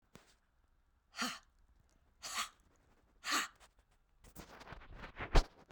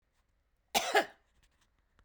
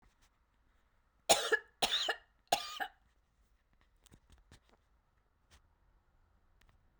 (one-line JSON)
{"exhalation_length": "5.7 s", "exhalation_amplitude": 6088, "exhalation_signal_mean_std_ratio": 0.26, "cough_length": "2.0 s", "cough_amplitude": 6895, "cough_signal_mean_std_ratio": 0.27, "three_cough_length": "7.0 s", "three_cough_amplitude": 7887, "three_cough_signal_mean_std_ratio": 0.25, "survey_phase": "beta (2021-08-13 to 2022-03-07)", "age": "65+", "gender": "Female", "wearing_mask": "No", "symptom_sore_throat": true, "symptom_onset": "2 days", "smoker_status": "Ex-smoker", "respiratory_condition_asthma": false, "respiratory_condition_other": false, "recruitment_source": "REACT", "submission_delay": "7 days", "covid_test_result": "Negative", "covid_test_method": "RT-qPCR"}